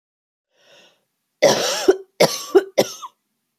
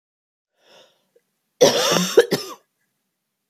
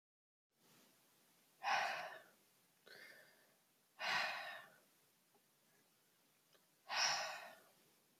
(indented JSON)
{
  "three_cough_length": "3.6 s",
  "three_cough_amplitude": 29869,
  "three_cough_signal_mean_std_ratio": 0.36,
  "cough_length": "3.5 s",
  "cough_amplitude": 28133,
  "cough_signal_mean_std_ratio": 0.32,
  "exhalation_length": "8.2 s",
  "exhalation_amplitude": 1795,
  "exhalation_signal_mean_std_ratio": 0.38,
  "survey_phase": "beta (2021-08-13 to 2022-03-07)",
  "age": "18-44",
  "gender": "Female",
  "wearing_mask": "No",
  "symptom_cough_any": true,
  "symptom_runny_or_blocked_nose": true,
  "symptom_sore_throat": true,
  "symptom_fatigue": true,
  "symptom_onset": "5 days",
  "smoker_status": "Never smoked",
  "respiratory_condition_asthma": false,
  "respiratory_condition_other": false,
  "recruitment_source": "Test and Trace",
  "submission_delay": "2 days",
  "covid_test_result": "Positive",
  "covid_test_method": "RT-qPCR",
  "covid_ct_value": 15.7,
  "covid_ct_gene": "ORF1ab gene",
  "covid_ct_mean": 16.1,
  "covid_viral_load": "5100000 copies/ml",
  "covid_viral_load_category": "High viral load (>1M copies/ml)"
}